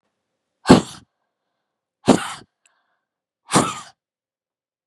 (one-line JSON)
{"exhalation_length": "4.9 s", "exhalation_amplitude": 32768, "exhalation_signal_mean_std_ratio": 0.22, "survey_phase": "beta (2021-08-13 to 2022-03-07)", "age": "45-64", "gender": "Female", "wearing_mask": "No", "symptom_none": true, "symptom_onset": "5 days", "smoker_status": "Never smoked", "respiratory_condition_asthma": false, "respiratory_condition_other": false, "recruitment_source": "REACT", "submission_delay": "1 day", "covid_test_result": "Negative", "covid_test_method": "RT-qPCR", "influenza_a_test_result": "Negative", "influenza_b_test_result": "Negative"}